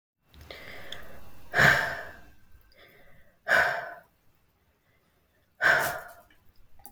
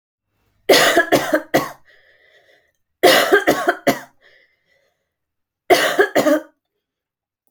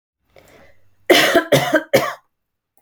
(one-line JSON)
{"exhalation_length": "6.9 s", "exhalation_amplitude": 14339, "exhalation_signal_mean_std_ratio": 0.39, "three_cough_length": "7.5 s", "three_cough_amplitude": 30832, "three_cough_signal_mean_std_ratio": 0.41, "cough_length": "2.8 s", "cough_amplitude": 29972, "cough_signal_mean_std_ratio": 0.42, "survey_phase": "alpha (2021-03-01 to 2021-08-12)", "age": "18-44", "gender": "Female", "wearing_mask": "No", "symptom_none": true, "smoker_status": "Ex-smoker", "respiratory_condition_asthma": false, "respiratory_condition_other": false, "recruitment_source": "REACT", "submission_delay": "3 days", "covid_test_result": "Negative", "covid_test_method": "RT-qPCR"}